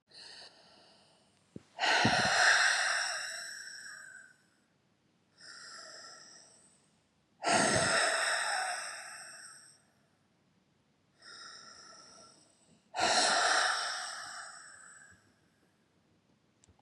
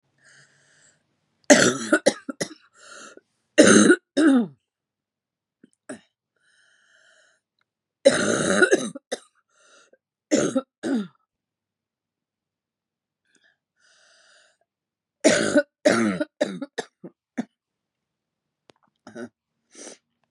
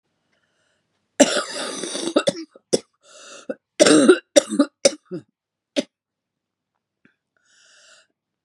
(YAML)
exhalation_length: 16.8 s
exhalation_amplitude: 6389
exhalation_signal_mean_std_ratio: 0.46
three_cough_length: 20.3 s
three_cough_amplitude: 32166
three_cough_signal_mean_std_ratio: 0.3
cough_length: 8.4 s
cough_amplitude: 32768
cough_signal_mean_std_ratio: 0.3
survey_phase: beta (2021-08-13 to 2022-03-07)
age: 45-64
gender: Female
wearing_mask: 'No'
symptom_cough_any: true
symptom_new_continuous_cough: true
symptom_runny_or_blocked_nose: true
symptom_sore_throat: true
symptom_fatigue: true
symptom_fever_high_temperature: true
symptom_headache: true
symptom_onset: 3 days
smoker_status: Ex-smoker
respiratory_condition_asthma: false
respiratory_condition_other: false
recruitment_source: Test and Trace
submission_delay: 1 day
covid_test_result: Positive
covid_test_method: RT-qPCR
covid_ct_value: 18.6
covid_ct_gene: N gene
covid_ct_mean: 19.5
covid_viral_load: 410000 copies/ml
covid_viral_load_category: Low viral load (10K-1M copies/ml)